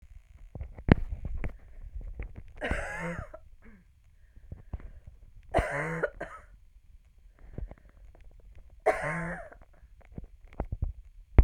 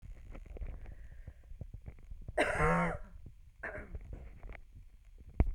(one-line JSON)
{"three_cough_length": "11.4 s", "three_cough_amplitude": 31669, "three_cough_signal_mean_std_ratio": 0.36, "cough_length": "5.5 s", "cough_amplitude": 7525, "cough_signal_mean_std_ratio": 0.53, "survey_phase": "beta (2021-08-13 to 2022-03-07)", "age": "45-64", "gender": "Female", "wearing_mask": "No", "symptom_none": true, "smoker_status": "Never smoked", "respiratory_condition_asthma": false, "respiratory_condition_other": false, "recruitment_source": "REACT", "submission_delay": "3 days", "covid_test_result": "Negative", "covid_test_method": "RT-qPCR", "influenza_a_test_result": "Unknown/Void", "influenza_b_test_result": "Unknown/Void"}